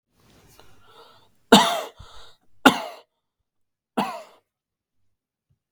{"three_cough_length": "5.7 s", "three_cough_amplitude": 32768, "three_cough_signal_mean_std_ratio": 0.23, "survey_phase": "beta (2021-08-13 to 2022-03-07)", "age": "18-44", "gender": "Male", "wearing_mask": "No", "symptom_none": true, "smoker_status": "Never smoked", "respiratory_condition_asthma": false, "respiratory_condition_other": false, "recruitment_source": "REACT", "submission_delay": "4 days", "covid_test_result": "Negative", "covid_test_method": "RT-qPCR", "influenza_a_test_result": "Negative", "influenza_b_test_result": "Negative"}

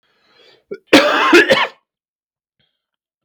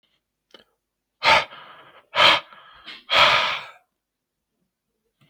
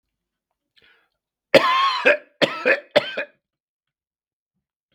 {"cough_length": "3.2 s", "cough_amplitude": 32768, "cough_signal_mean_std_ratio": 0.38, "exhalation_length": "5.3 s", "exhalation_amplitude": 29076, "exhalation_signal_mean_std_ratio": 0.34, "three_cough_length": "4.9 s", "three_cough_amplitude": 32768, "three_cough_signal_mean_std_ratio": 0.34, "survey_phase": "beta (2021-08-13 to 2022-03-07)", "age": "45-64", "gender": "Male", "wearing_mask": "No", "symptom_runny_or_blocked_nose": true, "symptom_sore_throat": true, "symptom_fatigue": true, "symptom_headache": true, "smoker_status": "Never smoked", "respiratory_condition_asthma": false, "respiratory_condition_other": false, "recruitment_source": "Test and Trace", "submission_delay": "1 day", "covid_test_result": "Negative", "covid_test_method": "RT-qPCR"}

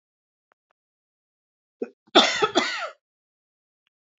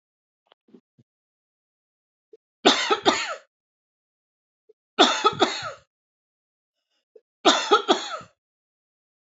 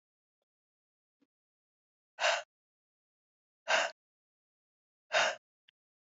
{"cough_length": "4.2 s", "cough_amplitude": 26869, "cough_signal_mean_std_ratio": 0.26, "three_cough_length": "9.3 s", "three_cough_amplitude": 25102, "three_cough_signal_mean_std_ratio": 0.3, "exhalation_length": "6.1 s", "exhalation_amplitude": 5610, "exhalation_signal_mean_std_ratio": 0.25, "survey_phase": "alpha (2021-03-01 to 2021-08-12)", "age": "45-64", "gender": "Female", "wearing_mask": "No", "symptom_none": true, "smoker_status": "Never smoked", "respiratory_condition_asthma": false, "respiratory_condition_other": false, "recruitment_source": "REACT", "submission_delay": "2 days", "covid_test_result": "Negative", "covid_test_method": "RT-qPCR"}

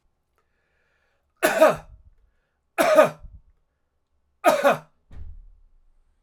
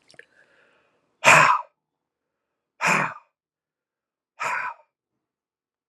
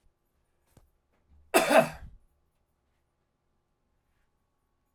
{"three_cough_length": "6.2 s", "three_cough_amplitude": 25444, "three_cough_signal_mean_std_ratio": 0.32, "exhalation_length": "5.9 s", "exhalation_amplitude": 29587, "exhalation_signal_mean_std_ratio": 0.28, "cough_length": "4.9 s", "cough_amplitude": 14366, "cough_signal_mean_std_ratio": 0.2, "survey_phase": "alpha (2021-03-01 to 2021-08-12)", "age": "45-64", "gender": "Male", "wearing_mask": "No", "symptom_none": true, "symptom_onset": "12 days", "smoker_status": "Ex-smoker", "respiratory_condition_asthma": false, "respiratory_condition_other": false, "recruitment_source": "REACT", "submission_delay": "2 days", "covid_test_result": "Negative", "covid_test_method": "RT-qPCR"}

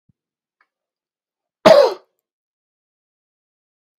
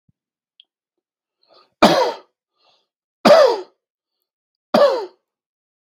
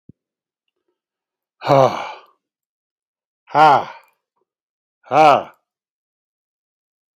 {"cough_length": "4.0 s", "cough_amplitude": 32768, "cough_signal_mean_std_ratio": 0.2, "three_cough_length": "5.9 s", "three_cough_amplitude": 32767, "three_cough_signal_mean_std_ratio": 0.31, "exhalation_length": "7.2 s", "exhalation_amplitude": 32768, "exhalation_signal_mean_std_ratio": 0.28, "survey_phase": "beta (2021-08-13 to 2022-03-07)", "age": "18-44", "gender": "Male", "wearing_mask": "No", "symptom_none": true, "smoker_status": "Never smoked", "respiratory_condition_asthma": false, "respiratory_condition_other": false, "recruitment_source": "REACT", "submission_delay": "1 day", "covid_test_result": "Negative", "covid_test_method": "RT-qPCR"}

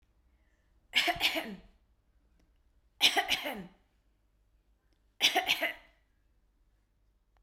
{"three_cough_length": "7.4 s", "three_cough_amplitude": 11423, "three_cough_signal_mean_std_ratio": 0.33, "survey_phase": "beta (2021-08-13 to 2022-03-07)", "age": "45-64", "gender": "Female", "wearing_mask": "No", "symptom_sore_throat": true, "smoker_status": "Never smoked", "respiratory_condition_asthma": false, "respiratory_condition_other": false, "recruitment_source": "REACT", "submission_delay": "3 days", "covid_test_result": "Negative", "covid_test_method": "RT-qPCR"}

